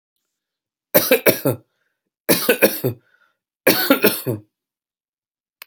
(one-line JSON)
{"three_cough_length": "5.7 s", "three_cough_amplitude": 32768, "three_cough_signal_mean_std_ratio": 0.37, "survey_phase": "alpha (2021-03-01 to 2021-08-12)", "age": "18-44", "gender": "Male", "wearing_mask": "No", "symptom_none": true, "smoker_status": "Never smoked", "respiratory_condition_asthma": false, "respiratory_condition_other": false, "recruitment_source": "REACT", "submission_delay": "6 days", "covid_test_result": "Negative", "covid_test_method": "RT-qPCR"}